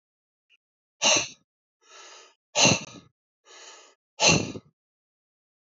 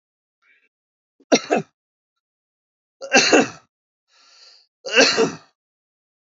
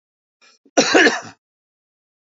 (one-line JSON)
{"exhalation_length": "5.6 s", "exhalation_amplitude": 22835, "exhalation_signal_mean_std_ratio": 0.3, "three_cough_length": "6.3 s", "three_cough_amplitude": 30222, "three_cough_signal_mean_std_ratio": 0.3, "cough_length": "2.3 s", "cough_amplitude": 32767, "cough_signal_mean_std_ratio": 0.32, "survey_phase": "alpha (2021-03-01 to 2021-08-12)", "age": "45-64", "gender": "Male", "wearing_mask": "No", "symptom_none": true, "smoker_status": "Ex-smoker", "respiratory_condition_asthma": false, "respiratory_condition_other": false, "recruitment_source": "REACT", "submission_delay": "3 days", "covid_test_method": "RT-qPCR"}